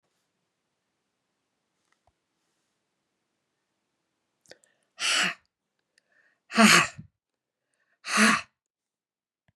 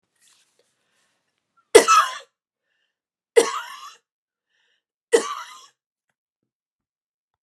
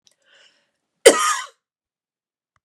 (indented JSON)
{
  "exhalation_length": "9.6 s",
  "exhalation_amplitude": 21599,
  "exhalation_signal_mean_std_ratio": 0.23,
  "three_cough_length": "7.4 s",
  "three_cough_amplitude": 32768,
  "three_cough_signal_mean_std_ratio": 0.21,
  "cough_length": "2.6 s",
  "cough_amplitude": 32768,
  "cough_signal_mean_std_ratio": 0.23,
  "survey_phase": "beta (2021-08-13 to 2022-03-07)",
  "age": "45-64",
  "gender": "Female",
  "wearing_mask": "No",
  "symptom_runny_or_blocked_nose": true,
  "symptom_fatigue": true,
  "symptom_headache": true,
  "smoker_status": "Ex-smoker",
  "respiratory_condition_asthma": false,
  "respiratory_condition_other": false,
  "recruitment_source": "Test and Trace",
  "submission_delay": "2 days",
  "covid_test_result": "Positive",
  "covid_test_method": "RT-qPCR",
  "covid_ct_value": 34.6,
  "covid_ct_gene": "ORF1ab gene"
}